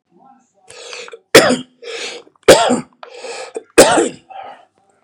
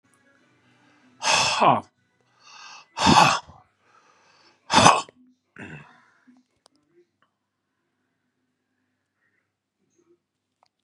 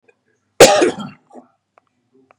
{
  "three_cough_length": "5.0 s",
  "three_cough_amplitude": 32768,
  "three_cough_signal_mean_std_ratio": 0.37,
  "exhalation_length": "10.8 s",
  "exhalation_amplitude": 32767,
  "exhalation_signal_mean_std_ratio": 0.26,
  "cough_length": "2.4 s",
  "cough_amplitude": 32768,
  "cough_signal_mean_std_ratio": 0.29,
  "survey_phase": "beta (2021-08-13 to 2022-03-07)",
  "age": "45-64",
  "gender": "Male",
  "wearing_mask": "No",
  "symptom_none": true,
  "smoker_status": "Never smoked",
  "respiratory_condition_asthma": false,
  "respiratory_condition_other": false,
  "recruitment_source": "REACT",
  "submission_delay": "1 day",
  "covid_test_result": "Negative",
  "covid_test_method": "RT-qPCR",
  "influenza_a_test_result": "Negative",
  "influenza_b_test_result": "Negative"
}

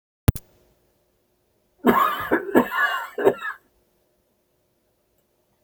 {
  "cough_length": "5.6 s",
  "cough_amplitude": 30602,
  "cough_signal_mean_std_ratio": 0.35,
  "survey_phase": "beta (2021-08-13 to 2022-03-07)",
  "age": "45-64",
  "gender": "Male",
  "wearing_mask": "No",
  "symptom_cough_any": true,
  "symptom_shortness_of_breath": true,
  "symptom_fatigue": true,
  "symptom_onset": "13 days",
  "smoker_status": "Never smoked",
  "respiratory_condition_asthma": false,
  "respiratory_condition_other": false,
  "recruitment_source": "REACT",
  "submission_delay": "2 days",
  "covid_test_result": "Negative",
  "covid_test_method": "RT-qPCR",
  "influenza_a_test_result": "Negative",
  "influenza_b_test_result": "Negative"
}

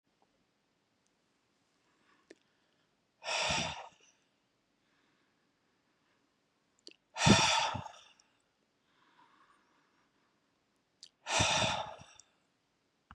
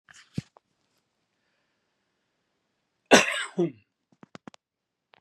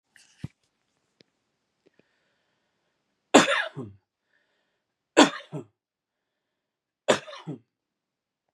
{
  "exhalation_length": "13.1 s",
  "exhalation_amplitude": 10312,
  "exhalation_signal_mean_std_ratio": 0.28,
  "cough_length": "5.2 s",
  "cough_amplitude": 32603,
  "cough_signal_mean_std_ratio": 0.19,
  "three_cough_length": "8.5 s",
  "three_cough_amplitude": 31977,
  "three_cough_signal_mean_std_ratio": 0.19,
  "survey_phase": "beta (2021-08-13 to 2022-03-07)",
  "age": "65+",
  "gender": "Male",
  "wearing_mask": "No",
  "symptom_none": true,
  "smoker_status": "Ex-smoker",
  "respiratory_condition_asthma": true,
  "respiratory_condition_other": false,
  "recruitment_source": "REACT",
  "submission_delay": "4 days",
  "covid_test_result": "Negative",
  "covid_test_method": "RT-qPCR",
  "influenza_a_test_result": "Negative",
  "influenza_b_test_result": "Negative"
}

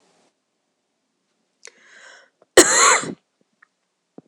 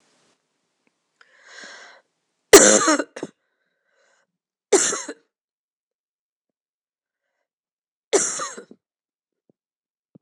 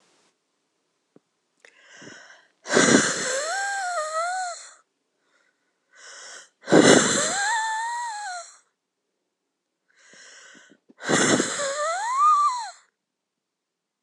{
  "cough_length": "4.3 s",
  "cough_amplitude": 26028,
  "cough_signal_mean_std_ratio": 0.25,
  "three_cough_length": "10.2 s",
  "three_cough_amplitude": 26028,
  "three_cough_signal_mean_std_ratio": 0.22,
  "exhalation_length": "14.0 s",
  "exhalation_amplitude": 26028,
  "exhalation_signal_mean_std_ratio": 0.46,
  "survey_phase": "beta (2021-08-13 to 2022-03-07)",
  "age": "45-64",
  "gender": "Female",
  "wearing_mask": "Yes",
  "symptom_cough_any": true,
  "symptom_new_continuous_cough": true,
  "symptom_runny_or_blocked_nose": true,
  "symptom_shortness_of_breath": true,
  "symptom_fatigue": true,
  "symptom_fever_high_temperature": true,
  "symptom_onset": "2 days",
  "smoker_status": "Never smoked",
  "respiratory_condition_asthma": false,
  "respiratory_condition_other": false,
  "recruitment_source": "Test and Trace",
  "submission_delay": "1 day",
  "covid_test_result": "Positive",
  "covid_test_method": "RT-qPCR",
  "covid_ct_value": 16.8,
  "covid_ct_gene": "ORF1ab gene"
}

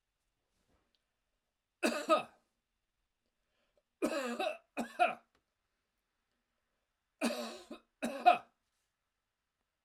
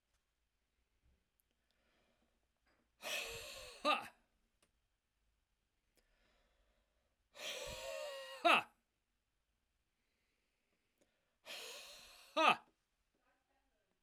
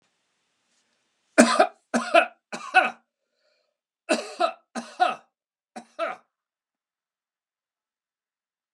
{
  "three_cough_length": "9.8 s",
  "three_cough_amplitude": 7478,
  "three_cough_signal_mean_std_ratio": 0.28,
  "exhalation_length": "14.0 s",
  "exhalation_amplitude": 5081,
  "exhalation_signal_mean_std_ratio": 0.24,
  "cough_length": "8.7 s",
  "cough_amplitude": 32767,
  "cough_signal_mean_std_ratio": 0.27,
  "survey_phase": "alpha (2021-03-01 to 2021-08-12)",
  "age": "65+",
  "gender": "Male",
  "wearing_mask": "No",
  "symptom_none": true,
  "smoker_status": "Never smoked",
  "respiratory_condition_asthma": false,
  "respiratory_condition_other": false,
  "recruitment_source": "REACT",
  "submission_delay": "1 day",
  "covid_test_result": "Negative",
  "covid_test_method": "RT-qPCR"
}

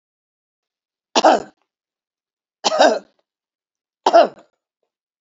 {
  "three_cough_length": "5.2 s",
  "three_cough_amplitude": 28927,
  "three_cough_signal_mean_std_ratio": 0.28,
  "survey_phase": "beta (2021-08-13 to 2022-03-07)",
  "age": "65+",
  "gender": "Female",
  "wearing_mask": "No",
  "symptom_shortness_of_breath": true,
  "smoker_status": "Ex-smoker",
  "respiratory_condition_asthma": false,
  "respiratory_condition_other": true,
  "recruitment_source": "REACT",
  "submission_delay": "2 days",
  "covid_test_result": "Negative",
  "covid_test_method": "RT-qPCR",
  "influenza_a_test_result": "Negative",
  "influenza_b_test_result": "Negative"
}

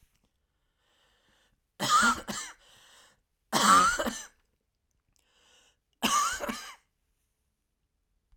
{
  "three_cough_length": "8.4 s",
  "three_cough_amplitude": 13117,
  "three_cough_signal_mean_std_ratio": 0.34,
  "survey_phase": "alpha (2021-03-01 to 2021-08-12)",
  "age": "65+",
  "gender": "Male",
  "wearing_mask": "No",
  "symptom_none": true,
  "smoker_status": "Never smoked",
  "respiratory_condition_asthma": false,
  "respiratory_condition_other": false,
  "recruitment_source": "REACT",
  "submission_delay": "3 days",
  "covid_test_result": "Negative",
  "covid_test_method": "RT-qPCR"
}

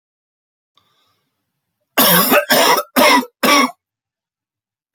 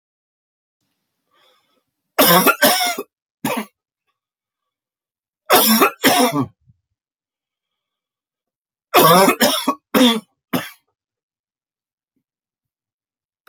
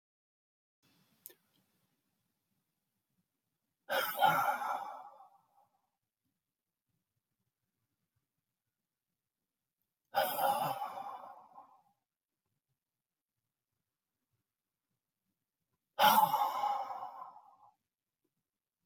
{
  "cough_length": "4.9 s",
  "cough_amplitude": 32768,
  "cough_signal_mean_std_ratio": 0.44,
  "three_cough_length": "13.5 s",
  "three_cough_amplitude": 31937,
  "three_cough_signal_mean_std_ratio": 0.35,
  "exhalation_length": "18.9 s",
  "exhalation_amplitude": 7450,
  "exhalation_signal_mean_std_ratio": 0.29,
  "survey_phase": "beta (2021-08-13 to 2022-03-07)",
  "age": "65+",
  "gender": "Male",
  "wearing_mask": "No",
  "symptom_cough_any": true,
  "symptom_sore_throat": true,
  "symptom_fatigue": true,
  "symptom_onset": "8 days",
  "smoker_status": "Never smoked",
  "respiratory_condition_asthma": false,
  "respiratory_condition_other": false,
  "recruitment_source": "REACT",
  "submission_delay": "1 day",
  "covid_test_result": "Negative",
  "covid_test_method": "RT-qPCR",
  "influenza_a_test_result": "Negative",
  "influenza_b_test_result": "Negative"
}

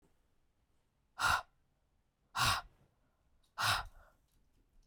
{
  "exhalation_length": "4.9 s",
  "exhalation_amplitude": 3549,
  "exhalation_signal_mean_std_ratio": 0.33,
  "survey_phase": "beta (2021-08-13 to 2022-03-07)",
  "age": "45-64",
  "gender": "Female",
  "wearing_mask": "No",
  "symptom_none": true,
  "smoker_status": "Ex-smoker",
  "respiratory_condition_asthma": false,
  "respiratory_condition_other": false,
  "recruitment_source": "REACT",
  "submission_delay": "1 day",
  "covid_test_result": "Negative",
  "covid_test_method": "RT-qPCR"
}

